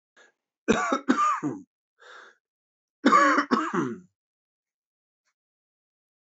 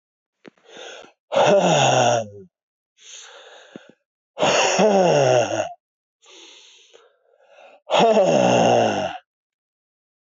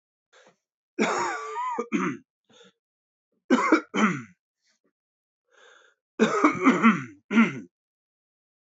cough_length: 6.3 s
cough_amplitude: 16967
cough_signal_mean_std_ratio: 0.38
exhalation_length: 10.2 s
exhalation_amplitude: 19259
exhalation_signal_mean_std_ratio: 0.52
three_cough_length: 8.7 s
three_cough_amplitude: 17856
three_cough_signal_mean_std_ratio: 0.41
survey_phase: alpha (2021-03-01 to 2021-08-12)
age: 45-64
gender: Male
wearing_mask: 'No'
symptom_cough_any: true
symptom_abdominal_pain: true
symptom_fatigue: true
symptom_fever_high_temperature: true
symptom_change_to_sense_of_smell_or_taste: true
symptom_loss_of_taste: true
symptom_onset: 5 days
smoker_status: Never smoked
respiratory_condition_asthma: false
respiratory_condition_other: false
recruitment_source: Test and Trace
submission_delay: 1 day
covid_test_result: Positive
covid_test_method: RT-qPCR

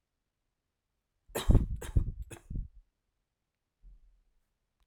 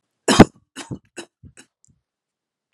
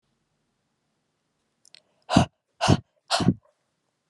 three_cough_length: 4.9 s
three_cough_amplitude: 11765
three_cough_signal_mean_std_ratio: 0.26
cough_length: 2.7 s
cough_amplitude: 32768
cough_signal_mean_std_ratio: 0.18
exhalation_length: 4.1 s
exhalation_amplitude: 24324
exhalation_signal_mean_std_ratio: 0.26
survey_phase: alpha (2021-03-01 to 2021-08-12)
age: 18-44
gender: Female
wearing_mask: 'No'
symptom_none: true
smoker_status: Never smoked
respiratory_condition_asthma: false
respiratory_condition_other: false
recruitment_source: REACT
submission_delay: 1 day
covid_test_result: Negative
covid_test_method: RT-qPCR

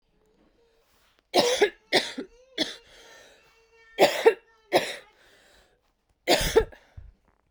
three_cough_length: 7.5 s
three_cough_amplitude: 20335
three_cough_signal_mean_std_ratio: 0.33
survey_phase: beta (2021-08-13 to 2022-03-07)
age: 18-44
gender: Female
wearing_mask: 'No'
symptom_cough_any: true
symptom_runny_or_blocked_nose: true
symptom_sore_throat: true
symptom_abdominal_pain: true
symptom_fatigue: true
symptom_fever_high_temperature: true
symptom_headache: true
symptom_change_to_sense_of_smell_or_taste: true
symptom_loss_of_taste: true
symptom_other: true
symptom_onset: 2 days
smoker_status: Current smoker (11 or more cigarettes per day)
respiratory_condition_asthma: false
respiratory_condition_other: false
recruitment_source: Test and Trace
submission_delay: 2 days
covid_test_result: Positive
covid_test_method: RT-qPCR
covid_ct_value: 23.0
covid_ct_gene: ORF1ab gene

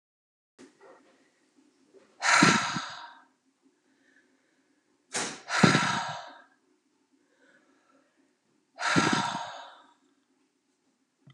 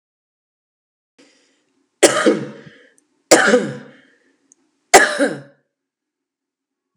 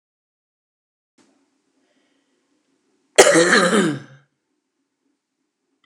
exhalation_length: 11.3 s
exhalation_amplitude: 19850
exhalation_signal_mean_std_ratio: 0.33
three_cough_length: 7.0 s
three_cough_amplitude: 32768
three_cough_signal_mean_std_ratio: 0.29
cough_length: 5.9 s
cough_amplitude: 32768
cough_signal_mean_std_ratio: 0.28
survey_phase: alpha (2021-03-01 to 2021-08-12)
age: 45-64
gender: Female
wearing_mask: 'No'
symptom_fatigue: true
smoker_status: Current smoker (1 to 10 cigarettes per day)
respiratory_condition_asthma: false
respiratory_condition_other: false
recruitment_source: REACT
submission_delay: 2 days
covid_test_result: Negative
covid_test_method: RT-qPCR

